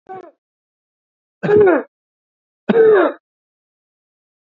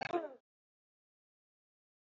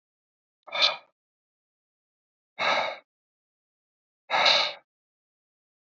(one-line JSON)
{"three_cough_length": "4.5 s", "three_cough_amplitude": 27243, "three_cough_signal_mean_std_ratio": 0.37, "cough_length": "2.0 s", "cough_amplitude": 2055, "cough_signal_mean_std_ratio": 0.25, "exhalation_length": "5.8 s", "exhalation_amplitude": 16377, "exhalation_signal_mean_std_ratio": 0.31, "survey_phase": "beta (2021-08-13 to 2022-03-07)", "age": "45-64", "gender": "Male", "wearing_mask": "No", "symptom_none": true, "smoker_status": "Never smoked", "respiratory_condition_asthma": false, "respiratory_condition_other": false, "recruitment_source": "REACT", "submission_delay": "2 days", "covid_test_result": "Negative", "covid_test_method": "RT-qPCR", "influenza_a_test_result": "Negative", "influenza_b_test_result": "Negative"}